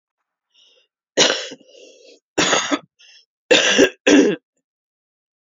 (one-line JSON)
{"three_cough_length": "5.5 s", "three_cough_amplitude": 29551, "three_cough_signal_mean_std_ratio": 0.39, "survey_phase": "beta (2021-08-13 to 2022-03-07)", "age": "45-64", "gender": "Female", "wearing_mask": "No", "symptom_sore_throat": true, "symptom_fatigue": true, "symptom_fever_high_temperature": true, "symptom_onset": "2 days", "smoker_status": "Never smoked", "respiratory_condition_asthma": false, "respiratory_condition_other": false, "recruitment_source": "Test and Trace", "submission_delay": "1 day", "covid_test_result": "Positive", "covid_test_method": "ePCR"}